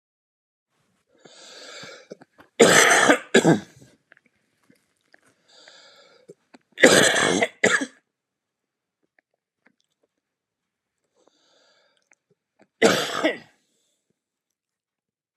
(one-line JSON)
{"three_cough_length": "15.4 s", "three_cough_amplitude": 32768, "three_cough_signal_mean_std_ratio": 0.28, "survey_phase": "beta (2021-08-13 to 2022-03-07)", "age": "45-64", "gender": "Male", "wearing_mask": "No", "symptom_none": true, "smoker_status": "Never smoked", "respiratory_condition_asthma": true, "respiratory_condition_other": false, "recruitment_source": "REACT", "submission_delay": "1 day", "covid_test_result": "Negative", "covid_test_method": "RT-qPCR", "influenza_a_test_result": "Negative", "influenza_b_test_result": "Negative"}